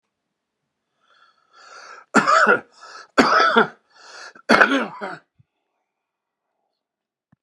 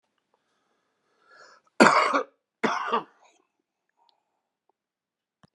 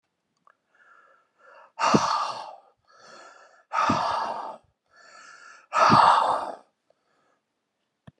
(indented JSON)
{
  "three_cough_length": "7.4 s",
  "three_cough_amplitude": 32767,
  "three_cough_signal_mean_std_ratio": 0.34,
  "cough_length": "5.5 s",
  "cough_amplitude": 31078,
  "cough_signal_mean_std_ratio": 0.26,
  "exhalation_length": "8.2 s",
  "exhalation_amplitude": 21218,
  "exhalation_signal_mean_std_ratio": 0.39,
  "survey_phase": "beta (2021-08-13 to 2022-03-07)",
  "age": "65+",
  "gender": "Male",
  "wearing_mask": "No",
  "symptom_cough_any": true,
  "symptom_change_to_sense_of_smell_or_taste": true,
  "symptom_loss_of_taste": true,
  "smoker_status": "Ex-smoker",
  "respiratory_condition_asthma": false,
  "respiratory_condition_other": false,
  "recruitment_source": "REACT",
  "submission_delay": "3 days",
  "covid_test_result": "Negative",
  "covid_test_method": "RT-qPCR"
}